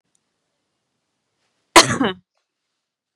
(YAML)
cough_length: 3.2 s
cough_amplitude: 32768
cough_signal_mean_std_ratio: 0.2
survey_phase: beta (2021-08-13 to 2022-03-07)
age: 45-64
gender: Female
wearing_mask: 'No'
symptom_fatigue: true
smoker_status: Ex-smoker
respiratory_condition_asthma: false
respiratory_condition_other: false
recruitment_source: REACT
submission_delay: 4 days
covid_test_result: Negative
covid_test_method: RT-qPCR